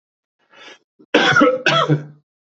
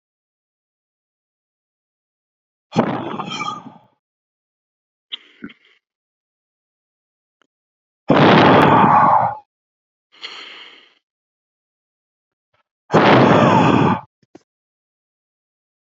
cough_length: 2.5 s
cough_amplitude: 28273
cough_signal_mean_std_ratio: 0.49
exhalation_length: 15.9 s
exhalation_amplitude: 28425
exhalation_signal_mean_std_ratio: 0.35
survey_phase: beta (2021-08-13 to 2022-03-07)
age: 18-44
gender: Male
wearing_mask: 'No'
symptom_runny_or_blocked_nose: true
symptom_sore_throat: true
symptom_fatigue: true
symptom_fever_high_temperature: true
symptom_headache: true
smoker_status: Never smoked
respiratory_condition_asthma: false
respiratory_condition_other: false
recruitment_source: Test and Trace
submission_delay: 1 day
covid_test_result: Positive
covid_test_method: RT-qPCR
covid_ct_value: 18.8
covid_ct_gene: ORF1ab gene
covid_ct_mean: 19.8
covid_viral_load: 330000 copies/ml
covid_viral_load_category: Low viral load (10K-1M copies/ml)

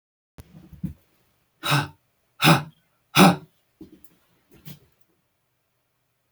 exhalation_length: 6.3 s
exhalation_amplitude: 30929
exhalation_signal_mean_std_ratio: 0.25
survey_phase: beta (2021-08-13 to 2022-03-07)
age: 65+
gender: Male
wearing_mask: 'No'
symptom_cough_any: true
symptom_sore_throat: true
symptom_onset: 2 days
smoker_status: Ex-smoker
respiratory_condition_asthma: false
respiratory_condition_other: false
recruitment_source: Test and Trace
submission_delay: 1 day
covid_test_result: Positive
covid_test_method: RT-qPCR
covid_ct_value: 19.7
covid_ct_gene: N gene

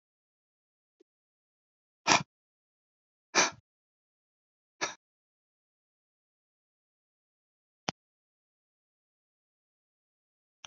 exhalation_length: 10.7 s
exhalation_amplitude: 20664
exhalation_signal_mean_std_ratio: 0.13
survey_phase: beta (2021-08-13 to 2022-03-07)
age: 65+
gender: Male
wearing_mask: 'No'
symptom_none: true
smoker_status: Never smoked
respiratory_condition_asthma: false
respiratory_condition_other: false
recruitment_source: REACT
submission_delay: 2 days
covid_test_result: Negative
covid_test_method: RT-qPCR
influenza_a_test_result: Negative
influenza_b_test_result: Negative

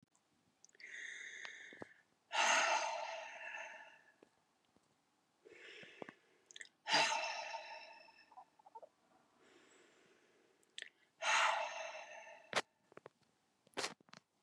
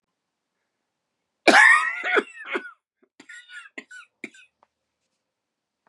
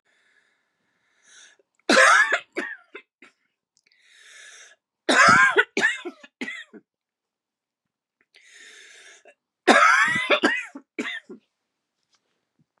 exhalation_length: 14.4 s
exhalation_amplitude: 3378
exhalation_signal_mean_std_ratio: 0.39
cough_length: 5.9 s
cough_amplitude: 29420
cough_signal_mean_std_ratio: 0.27
three_cough_length: 12.8 s
three_cough_amplitude: 29691
three_cough_signal_mean_std_ratio: 0.35
survey_phase: beta (2021-08-13 to 2022-03-07)
age: 45-64
gender: Female
wearing_mask: 'Yes'
symptom_cough_any: true
symptom_runny_or_blocked_nose: true
symptom_fatigue: true
symptom_headache: true
symptom_change_to_sense_of_smell_or_taste: true
symptom_onset: 3 days
smoker_status: Never smoked
respiratory_condition_asthma: false
respiratory_condition_other: false
recruitment_source: Test and Trace
submission_delay: 2 days
covid_test_result: Positive
covid_test_method: RT-qPCR
covid_ct_value: 16.0
covid_ct_gene: ORF1ab gene
covid_ct_mean: 16.1
covid_viral_load: 5100000 copies/ml
covid_viral_load_category: High viral load (>1M copies/ml)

